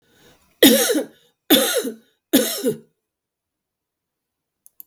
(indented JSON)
{
  "three_cough_length": "4.9 s",
  "three_cough_amplitude": 32768,
  "three_cough_signal_mean_std_ratio": 0.36,
  "survey_phase": "beta (2021-08-13 to 2022-03-07)",
  "age": "65+",
  "gender": "Female",
  "wearing_mask": "No",
  "symptom_none": true,
  "smoker_status": "Ex-smoker",
  "respiratory_condition_asthma": false,
  "respiratory_condition_other": true,
  "recruitment_source": "Test and Trace",
  "submission_delay": "-1 day",
  "covid_test_result": "Positive",
  "covid_test_method": "LFT"
}